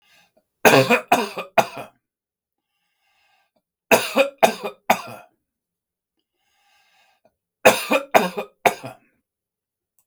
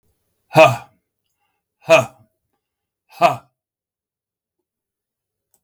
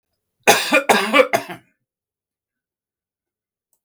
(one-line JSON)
{"three_cough_length": "10.1 s", "three_cough_amplitude": 32768, "three_cough_signal_mean_std_ratio": 0.3, "exhalation_length": "5.6 s", "exhalation_amplitude": 32768, "exhalation_signal_mean_std_ratio": 0.23, "cough_length": "3.8 s", "cough_amplitude": 32768, "cough_signal_mean_std_ratio": 0.33, "survey_phase": "beta (2021-08-13 to 2022-03-07)", "age": "65+", "gender": "Male", "wearing_mask": "No", "symptom_none": true, "smoker_status": "Never smoked", "respiratory_condition_asthma": false, "respiratory_condition_other": false, "recruitment_source": "REACT", "submission_delay": "1 day", "covid_test_result": "Negative", "covid_test_method": "RT-qPCR", "influenza_a_test_result": "Negative", "influenza_b_test_result": "Negative"}